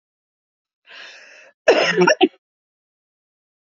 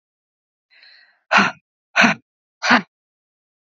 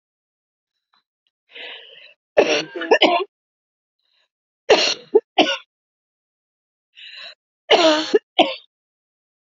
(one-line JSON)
{"cough_length": "3.8 s", "cough_amplitude": 27331, "cough_signal_mean_std_ratio": 0.3, "exhalation_length": "3.8 s", "exhalation_amplitude": 32768, "exhalation_signal_mean_std_ratio": 0.3, "three_cough_length": "9.5 s", "three_cough_amplitude": 32767, "three_cough_signal_mean_std_ratio": 0.32, "survey_phase": "beta (2021-08-13 to 2022-03-07)", "age": "45-64", "gender": "Female", "wearing_mask": "No", "symptom_headache": true, "symptom_onset": "6 days", "smoker_status": "Ex-smoker", "respiratory_condition_asthma": false, "respiratory_condition_other": false, "recruitment_source": "Test and Trace", "submission_delay": "1 day", "covid_test_result": "Positive", "covid_test_method": "RT-qPCR", "covid_ct_value": 18.6, "covid_ct_gene": "ORF1ab gene", "covid_ct_mean": 19.1, "covid_viral_load": "540000 copies/ml", "covid_viral_load_category": "Low viral load (10K-1M copies/ml)"}